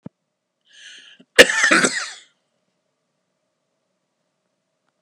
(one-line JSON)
{"cough_length": "5.0 s", "cough_amplitude": 32768, "cough_signal_mean_std_ratio": 0.23, "survey_phase": "beta (2021-08-13 to 2022-03-07)", "age": "65+", "gender": "Male", "wearing_mask": "No", "symptom_cough_any": true, "smoker_status": "Ex-smoker", "respiratory_condition_asthma": false, "respiratory_condition_other": false, "recruitment_source": "REACT", "submission_delay": "1 day", "covid_test_result": "Negative", "covid_test_method": "RT-qPCR"}